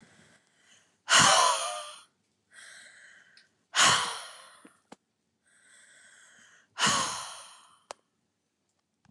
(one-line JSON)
{"exhalation_length": "9.1 s", "exhalation_amplitude": 12791, "exhalation_signal_mean_std_ratio": 0.33, "survey_phase": "beta (2021-08-13 to 2022-03-07)", "age": "45-64", "gender": "Female", "wearing_mask": "No", "symptom_none": true, "smoker_status": "Never smoked", "respiratory_condition_asthma": true, "respiratory_condition_other": false, "recruitment_source": "REACT", "submission_delay": "1 day", "covid_test_result": "Negative", "covid_test_method": "RT-qPCR", "influenza_a_test_result": "Negative", "influenza_b_test_result": "Negative"}